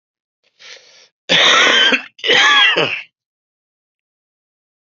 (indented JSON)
{
  "cough_length": "4.9 s",
  "cough_amplitude": 32767,
  "cough_signal_mean_std_ratio": 0.47,
  "survey_phase": "beta (2021-08-13 to 2022-03-07)",
  "age": "45-64",
  "gender": "Male",
  "wearing_mask": "No",
  "symptom_cough_any": true,
  "symptom_runny_or_blocked_nose": true,
  "symptom_fatigue": true,
  "symptom_fever_high_temperature": true,
  "symptom_onset": "4 days",
  "smoker_status": "Never smoked",
  "respiratory_condition_asthma": false,
  "respiratory_condition_other": false,
  "recruitment_source": "Test and Trace",
  "submission_delay": "2 days",
  "covid_test_result": "Positive",
  "covid_test_method": "RT-qPCR"
}